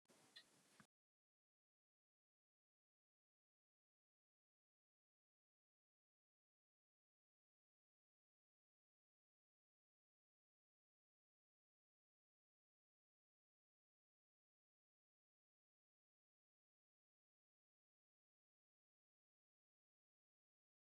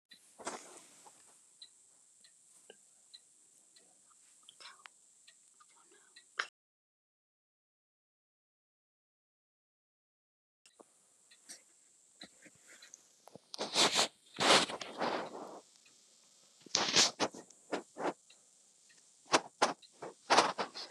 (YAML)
three_cough_length: 20.9 s
three_cough_amplitude: 116
three_cough_signal_mean_std_ratio: 0.11
cough_length: 20.9 s
cough_amplitude: 15492
cough_signal_mean_std_ratio: 0.27
survey_phase: beta (2021-08-13 to 2022-03-07)
age: 65+
gender: Male
wearing_mask: 'No'
symptom_none: true
smoker_status: Never smoked
respiratory_condition_asthma: false
respiratory_condition_other: false
recruitment_source: REACT
submission_delay: 4 days
covid_test_result: Negative
covid_test_method: RT-qPCR
influenza_a_test_result: Negative
influenza_b_test_result: Negative